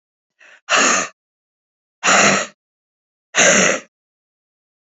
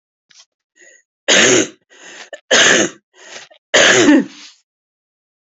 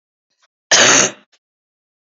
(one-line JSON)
{"exhalation_length": "4.9 s", "exhalation_amplitude": 30505, "exhalation_signal_mean_std_ratio": 0.41, "three_cough_length": "5.5 s", "three_cough_amplitude": 31983, "three_cough_signal_mean_std_ratio": 0.43, "cough_length": "2.1 s", "cough_amplitude": 31564, "cough_signal_mean_std_ratio": 0.35, "survey_phase": "beta (2021-08-13 to 2022-03-07)", "age": "45-64", "gender": "Female", "wearing_mask": "No", "symptom_cough_any": true, "symptom_shortness_of_breath": true, "symptom_fatigue": true, "symptom_headache": true, "smoker_status": "Never smoked", "respiratory_condition_asthma": true, "respiratory_condition_other": false, "recruitment_source": "Test and Trace", "submission_delay": "2 days", "covid_test_result": "Positive", "covid_test_method": "RT-qPCR", "covid_ct_value": 18.3, "covid_ct_gene": "ORF1ab gene", "covid_ct_mean": 18.5, "covid_viral_load": "860000 copies/ml", "covid_viral_load_category": "Low viral load (10K-1M copies/ml)"}